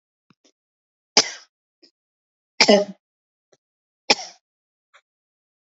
{
  "three_cough_length": "5.7 s",
  "three_cough_amplitude": 32065,
  "three_cough_signal_mean_std_ratio": 0.19,
  "survey_phase": "beta (2021-08-13 to 2022-03-07)",
  "age": "45-64",
  "gender": "Female",
  "wearing_mask": "No",
  "symptom_fatigue": true,
  "symptom_headache": true,
  "smoker_status": "Never smoked",
  "respiratory_condition_asthma": false,
  "respiratory_condition_other": false,
  "recruitment_source": "REACT",
  "submission_delay": "2 days",
  "covid_test_result": "Negative",
  "covid_test_method": "RT-qPCR",
  "influenza_a_test_result": "Negative",
  "influenza_b_test_result": "Negative"
}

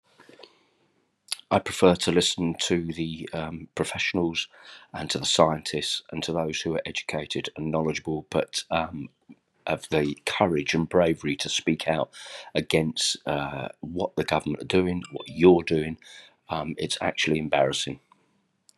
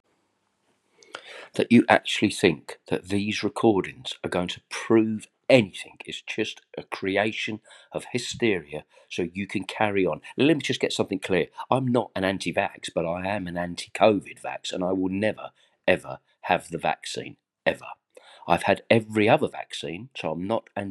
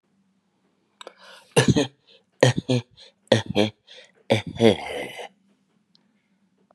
{
  "cough_length": "18.8 s",
  "cough_amplitude": 21091,
  "cough_signal_mean_std_ratio": 0.56,
  "exhalation_length": "20.9 s",
  "exhalation_amplitude": 31256,
  "exhalation_signal_mean_std_ratio": 0.51,
  "three_cough_length": "6.7 s",
  "three_cough_amplitude": 31980,
  "three_cough_signal_mean_std_ratio": 0.32,
  "survey_phase": "beta (2021-08-13 to 2022-03-07)",
  "age": "45-64",
  "gender": "Male",
  "wearing_mask": "No",
  "symptom_cough_any": true,
  "symptom_shortness_of_breath": true,
  "symptom_fatigue": true,
  "symptom_headache": true,
  "symptom_onset": "3 days",
  "smoker_status": "Ex-smoker",
  "respiratory_condition_asthma": true,
  "respiratory_condition_other": false,
  "recruitment_source": "Test and Trace",
  "submission_delay": "1 day",
  "covid_test_result": "Negative",
  "covid_test_method": "RT-qPCR"
}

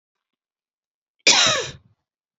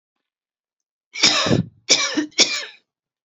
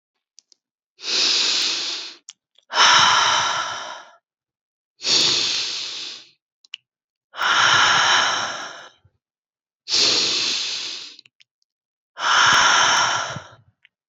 {
  "cough_length": "2.4 s",
  "cough_amplitude": 29866,
  "cough_signal_mean_std_ratio": 0.31,
  "three_cough_length": "3.2 s",
  "three_cough_amplitude": 32767,
  "three_cough_signal_mean_std_ratio": 0.43,
  "exhalation_length": "14.1 s",
  "exhalation_amplitude": 25999,
  "exhalation_signal_mean_std_ratio": 0.58,
  "survey_phase": "beta (2021-08-13 to 2022-03-07)",
  "age": "45-64",
  "gender": "Female",
  "wearing_mask": "No",
  "symptom_runny_or_blocked_nose": true,
  "smoker_status": "Never smoked",
  "respiratory_condition_asthma": false,
  "respiratory_condition_other": false,
  "recruitment_source": "Test and Trace",
  "submission_delay": "2 days",
  "covid_test_result": "Positive",
  "covid_test_method": "ePCR"
}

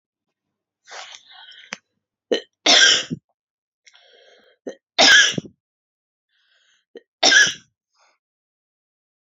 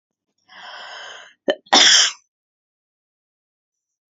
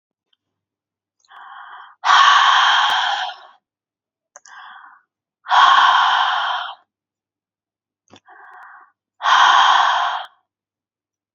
{
  "three_cough_length": "9.4 s",
  "three_cough_amplitude": 32767,
  "three_cough_signal_mean_std_ratio": 0.28,
  "cough_length": "4.1 s",
  "cough_amplitude": 32768,
  "cough_signal_mean_std_ratio": 0.29,
  "exhalation_length": "11.3 s",
  "exhalation_amplitude": 28066,
  "exhalation_signal_mean_std_ratio": 0.46,
  "survey_phase": "beta (2021-08-13 to 2022-03-07)",
  "age": "45-64",
  "gender": "Female",
  "wearing_mask": "No",
  "symptom_none": true,
  "smoker_status": "Never smoked",
  "respiratory_condition_asthma": false,
  "respiratory_condition_other": false,
  "recruitment_source": "Test and Trace",
  "submission_delay": "0 days",
  "covid_test_result": "Negative",
  "covid_test_method": "LFT"
}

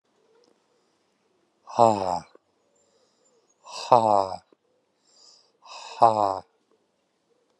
{
  "exhalation_length": "7.6 s",
  "exhalation_amplitude": 29633,
  "exhalation_signal_mean_std_ratio": 0.25,
  "survey_phase": "alpha (2021-03-01 to 2021-08-12)",
  "age": "45-64",
  "gender": "Male",
  "wearing_mask": "No",
  "symptom_none": true,
  "smoker_status": "Ex-smoker",
  "respiratory_condition_asthma": false,
  "respiratory_condition_other": false,
  "recruitment_source": "REACT",
  "submission_delay": "4 days",
  "covid_test_result": "Negative",
  "covid_test_method": "RT-qPCR"
}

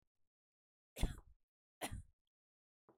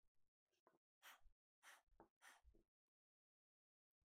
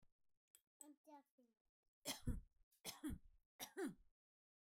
{
  "cough_length": "3.0 s",
  "cough_amplitude": 2574,
  "cough_signal_mean_std_ratio": 0.22,
  "exhalation_length": "4.1 s",
  "exhalation_amplitude": 77,
  "exhalation_signal_mean_std_ratio": 0.41,
  "three_cough_length": "4.6 s",
  "three_cough_amplitude": 750,
  "three_cough_signal_mean_std_ratio": 0.36,
  "survey_phase": "beta (2021-08-13 to 2022-03-07)",
  "age": "18-44",
  "gender": "Female",
  "wearing_mask": "No",
  "symptom_none": true,
  "smoker_status": "Ex-smoker",
  "respiratory_condition_asthma": true,
  "respiratory_condition_other": false,
  "recruitment_source": "REACT",
  "submission_delay": "2 days",
  "covid_test_result": "Negative",
  "covid_test_method": "RT-qPCR"
}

